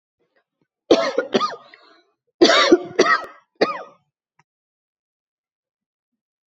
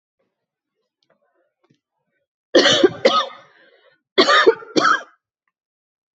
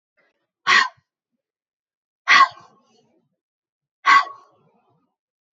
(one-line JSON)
{"cough_length": "6.5 s", "cough_amplitude": 29924, "cough_signal_mean_std_ratio": 0.33, "three_cough_length": "6.1 s", "three_cough_amplitude": 30763, "three_cough_signal_mean_std_ratio": 0.34, "exhalation_length": "5.5 s", "exhalation_amplitude": 27303, "exhalation_signal_mean_std_ratio": 0.26, "survey_phase": "alpha (2021-03-01 to 2021-08-12)", "age": "45-64", "gender": "Female", "wearing_mask": "No", "symptom_cough_any": true, "symptom_fatigue": true, "symptom_headache": true, "symptom_change_to_sense_of_smell_or_taste": true, "symptom_onset": "6 days", "smoker_status": "Never smoked", "respiratory_condition_asthma": false, "respiratory_condition_other": false, "recruitment_source": "Test and Trace", "submission_delay": "2 days", "covid_test_result": "Positive", "covid_test_method": "RT-qPCR", "covid_ct_value": 14.7, "covid_ct_gene": "ORF1ab gene", "covid_ct_mean": 15.2, "covid_viral_load": "11000000 copies/ml", "covid_viral_load_category": "High viral load (>1M copies/ml)"}